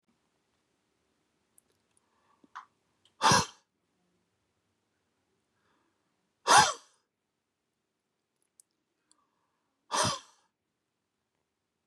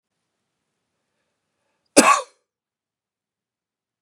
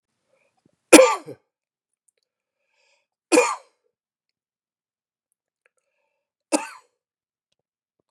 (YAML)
exhalation_length: 11.9 s
exhalation_amplitude: 14452
exhalation_signal_mean_std_ratio: 0.18
cough_length: 4.0 s
cough_amplitude: 32768
cough_signal_mean_std_ratio: 0.18
three_cough_length: 8.1 s
three_cough_amplitude: 32768
three_cough_signal_mean_std_ratio: 0.17
survey_phase: beta (2021-08-13 to 2022-03-07)
age: 45-64
gender: Male
wearing_mask: 'No'
symptom_runny_or_blocked_nose: true
symptom_headache: true
symptom_onset: 9 days
smoker_status: Never smoked
respiratory_condition_asthma: true
respiratory_condition_other: false
recruitment_source: REACT
submission_delay: 1 day
covid_test_result: Negative
covid_test_method: RT-qPCR